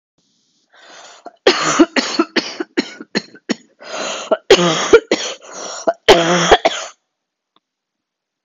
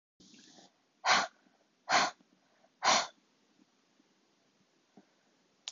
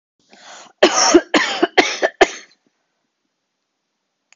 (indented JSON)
{
  "three_cough_length": "8.4 s",
  "three_cough_amplitude": 32768,
  "three_cough_signal_mean_std_ratio": 0.41,
  "exhalation_length": "5.7 s",
  "exhalation_amplitude": 7104,
  "exhalation_signal_mean_std_ratio": 0.28,
  "cough_length": "4.4 s",
  "cough_amplitude": 32768,
  "cough_signal_mean_std_ratio": 0.35,
  "survey_phase": "beta (2021-08-13 to 2022-03-07)",
  "age": "18-44",
  "gender": "Female",
  "wearing_mask": "No",
  "symptom_cough_any": true,
  "symptom_runny_or_blocked_nose": true,
  "symptom_sore_throat": true,
  "symptom_fatigue": true,
  "symptom_onset": "2 days",
  "smoker_status": "Never smoked",
  "respiratory_condition_asthma": false,
  "respiratory_condition_other": false,
  "recruitment_source": "Test and Trace",
  "submission_delay": "2 days",
  "covid_test_result": "Positive",
  "covid_test_method": "RT-qPCR",
  "covid_ct_value": 20.7,
  "covid_ct_gene": "N gene"
}